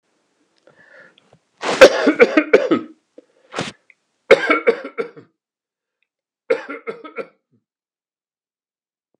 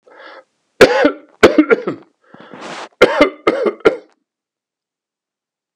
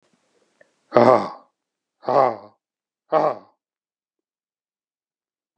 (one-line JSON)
{"three_cough_length": "9.2 s", "three_cough_amplitude": 32768, "three_cough_signal_mean_std_ratio": 0.28, "cough_length": "5.8 s", "cough_amplitude": 32768, "cough_signal_mean_std_ratio": 0.36, "exhalation_length": "5.6 s", "exhalation_amplitude": 32768, "exhalation_signal_mean_std_ratio": 0.26, "survey_phase": "alpha (2021-03-01 to 2021-08-12)", "age": "65+", "gender": "Male", "wearing_mask": "No", "symptom_none": true, "smoker_status": "Never smoked", "respiratory_condition_asthma": false, "respiratory_condition_other": false, "recruitment_source": "REACT", "submission_delay": "3 days", "covid_test_result": "Negative", "covid_test_method": "RT-qPCR"}